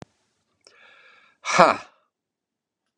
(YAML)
exhalation_length: 3.0 s
exhalation_amplitude: 32687
exhalation_signal_mean_std_ratio: 0.21
survey_phase: beta (2021-08-13 to 2022-03-07)
age: 65+
gender: Male
wearing_mask: 'No'
symptom_cough_any: true
symptom_runny_or_blocked_nose: true
symptom_sore_throat: true
symptom_diarrhoea: true
symptom_fatigue: true
symptom_headache: true
symptom_onset: 5 days
smoker_status: Never smoked
respiratory_condition_asthma: false
respiratory_condition_other: false
recruitment_source: Test and Trace
submission_delay: 2 days
covid_test_result: Positive
covid_test_method: ePCR